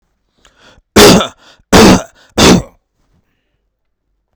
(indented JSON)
{
  "three_cough_length": "4.4 s",
  "three_cough_amplitude": 32768,
  "three_cough_signal_mean_std_ratio": 0.39,
  "survey_phase": "beta (2021-08-13 to 2022-03-07)",
  "age": "18-44",
  "gender": "Male",
  "wearing_mask": "No",
  "symptom_none": true,
  "smoker_status": "Ex-smoker",
  "respiratory_condition_asthma": false,
  "respiratory_condition_other": false,
  "recruitment_source": "REACT",
  "submission_delay": "22 days",
  "covid_test_result": "Negative",
  "covid_test_method": "RT-qPCR",
  "covid_ct_value": 46.0,
  "covid_ct_gene": "N gene"
}